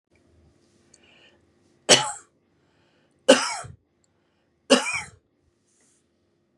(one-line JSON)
{"three_cough_length": "6.6 s", "three_cough_amplitude": 32411, "three_cough_signal_mean_std_ratio": 0.22, "survey_phase": "beta (2021-08-13 to 2022-03-07)", "age": "45-64", "gender": "Female", "wearing_mask": "No", "symptom_none": true, "smoker_status": "Never smoked", "respiratory_condition_asthma": false, "respiratory_condition_other": false, "recruitment_source": "REACT", "submission_delay": "2 days", "covid_test_result": "Negative", "covid_test_method": "RT-qPCR", "influenza_a_test_result": "Negative", "influenza_b_test_result": "Negative"}